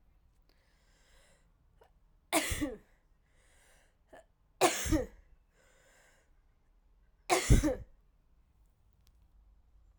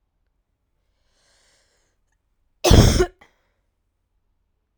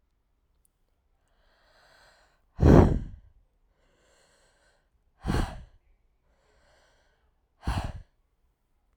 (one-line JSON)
{"three_cough_length": "10.0 s", "three_cough_amplitude": 10129, "three_cough_signal_mean_std_ratio": 0.27, "cough_length": "4.8 s", "cough_amplitude": 32768, "cough_signal_mean_std_ratio": 0.22, "exhalation_length": "9.0 s", "exhalation_amplitude": 22150, "exhalation_signal_mean_std_ratio": 0.22, "survey_phase": "alpha (2021-03-01 to 2021-08-12)", "age": "18-44", "gender": "Female", "wearing_mask": "No", "symptom_shortness_of_breath": true, "symptom_headache": true, "symptom_change_to_sense_of_smell_or_taste": true, "symptom_loss_of_taste": true, "symptom_onset": "2 days", "smoker_status": "Never smoked", "respiratory_condition_asthma": false, "respiratory_condition_other": false, "recruitment_source": "Test and Trace", "submission_delay": "1 day", "covid_test_result": "Positive", "covid_test_method": "RT-qPCR", "covid_ct_value": 20.1, "covid_ct_gene": "ORF1ab gene"}